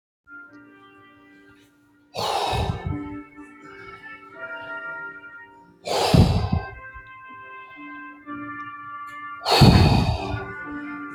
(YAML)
exhalation_length: 11.1 s
exhalation_amplitude: 27276
exhalation_signal_mean_std_ratio: 0.46
survey_phase: beta (2021-08-13 to 2022-03-07)
age: 18-44
gender: Male
wearing_mask: 'No'
symptom_none: true
smoker_status: Ex-smoker
respiratory_condition_asthma: false
respiratory_condition_other: false
recruitment_source: REACT
submission_delay: 1 day
covid_test_result: Negative
covid_test_method: RT-qPCR
influenza_a_test_result: Negative
influenza_b_test_result: Negative